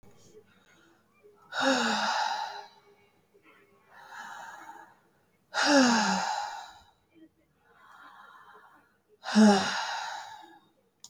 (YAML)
exhalation_length: 11.1 s
exhalation_amplitude: 10579
exhalation_signal_mean_std_ratio: 0.41
survey_phase: beta (2021-08-13 to 2022-03-07)
age: 65+
gender: Female
wearing_mask: 'No'
symptom_none: true
smoker_status: Never smoked
respiratory_condition_asthma: false
respiratory_condition_other: false
recruitment_source: REACT
submission_delay: 4 days
covid_test_result: Negative
covid_test_method: RT-qPCR
influenza_a_test_result: Negative
influenza_b_test_result: Negative